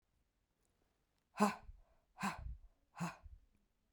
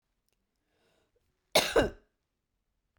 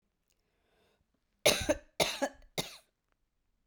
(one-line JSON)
{"exhalation_length": "3.9 s", "exhalation_amplitude": 4006, "exhalation_signal_mean_std_ratio": 0.3, "cough_length": "3.0 s", "cough_amplitude": 9936, "cough_signal_mean_std_ratio": 0.23, "three_cough_length": "3.7 s", "three_cough_amplitude": 9869, "three_cough_signal_mean_std_ratio": 0.29, "survey_phase": "beta (2021-08-13 to 2022-03-07)", "age": "18-44", "gender": "Female", "wearing_mask": "No", "symptom_cough_any": true, "symptom_runny_or_blocked_nose": true, "symptom_sore_throat": true, "symptom_fatigue": true, "symptom_fever_high_temperature": true, "symptom_other": true, "symptom_onset": "3 days", "smoker_status": "Ex-smoker", "respiratory_condition_asthma": false, "respiratory_condition_other": false, "recruitment_source": "REACT", "submission_delay": "1 day", "covid_test_result": "Negative", "covid_test_method": "RT-qPCR", "influenza_a_test_result": "Negative", "influenza_b_test_result": "Negative"}